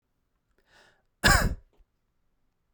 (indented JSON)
{
  "cough_length": "2.7 s",
  "cough_amplitude": 15191,
  "cough_signal_mean_std_ratio": 0.26,
  "survey_phase": "beta (2021-08-13 to 2022-03-07)",
  "age": "18-44",
  "gender": "Male",
  "wearing_mask": "No",
  "symptom_none": true,
  "smoker_status": "Never smoked",
  "respiratory_condition_asthma": false,
  "respiratory_condition_other": false,
  "recruitment_source": "REACT",
  "submission_delay": "0 days",
  "covid_test_result": "Negative",
  "covid_test_method": "RT-qPCR"
}